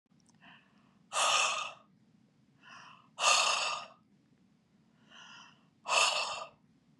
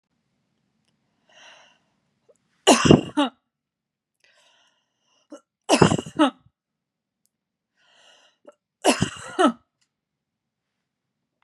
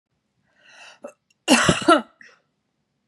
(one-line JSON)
{"exhalation_length": "7.0 s", "exhalation_amplitude": 7743, "exhalation_signal_mean_std_ratio": 0.42, "three_cough_length": "11.4 s", "three_cough_amplitude": 32763, "three_cough_signal_mean_std_ratio": 0.24, "cough_length": "3.1 s", "cough_amplitude": 29306, "cough_signal_mean_std_ratio": 0.3, "survey_phase": "beta (2021-08-13 to 2022-03-07)", "age": "45-64", "gender": "Female", "wearing_mask": "No", "symptom_cough_any": true, "symptom_sore_throat": true, "symptom_fatigue": true, "symptom_headache": true, "symptom_other": true, "symptom_onset": "6 days", "smoker_status": "Never smoked", "respiratory_condition_asthma": false, "respiratory_condition_other": false, "recruitment_source": "Test and Trace", "submission_delay": "1 day", "covid_test_result": "Positive", "covid_test_method": "LAMP"}